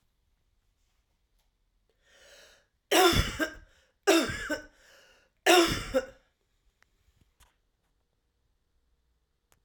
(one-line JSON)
{"three_cough_length": "9.6 s", "three_cough_amplitude": 14954, "three_cough_signal_mean_std_ratio": 0.29, "survey_phase": "alpha (2021-03-01 to 2021-08-12)", "age": "45-64", "gender": "Female", "wearing_mask": "No", "symptom_cough_any": true, "symptom_diarrhoea": true, "symptom_change_to_sense_of_smell_or_taste": true, "symptom_loss_of_taste": true, "smoker_status": "Ex-smoker", "respiratory_condition_asthma": false, "respiratory_condition_other": false, "recruitment_source": "Test and Trace", "submission_delay": "2 days", "covid_test_result": "Positive", "covid_test_method": "RT-qPCR", "covid_ct_value": 18.4, "covid_ct_gene": "ORF1ab gene", "covid_ct_mean": 22.3, "covid_viral_load": "50000 copies/ml", "covid_viral_load_category": "Low viral load (10K-1M copies/ml)"}